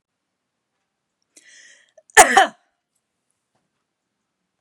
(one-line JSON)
{"cough_length": "4.6 s", "cough_amplitude": 32768, "cough_signal_mean_std_ratio": 0.18, "survey_phase": "beta (2021-08-13 to 2022-03-07)", "age": "18-44", "gender": "Female", "wearing_mask": "No", "symptom_none": true, "smoker_status": "Never smoked", "respiratory_condition_asthma": false, "respiratory_condition_other": false, "recruitment_source": "REACT", "submission_delay": "1 day", "covid_test_result": "Negative", "covid_test_method": "RT-qPCR", "influenza_a_test_result": "Negative", "influenza_b_test_result": "Negative"}